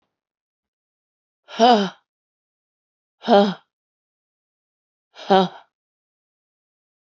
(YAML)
exhalation_length: 7.1 s
exhalation_amplitude: 27324
exhalation_signal_mean_std_ratio: 0.24
survey_phase: beta (2021-08-13 to 2022-03-07)
age: 45-64
gender: Female
wearing_mask: 'No'
symptom_cough_any: true
symptom_runny_or_blocked_nose: true
symptom_shortness_of_breath: true
symptom_sore_throat: true
symptom_fatigue: true
symptom_headache: true
symptom_other: true
smoker_status: Never smoked
respiratory_condition_asthma: false
respiratory_condition_other: false
recruitment_source: Test and Trace
submission_delay: -5 days
covid_test_result: Positive
covid_test_method: LFT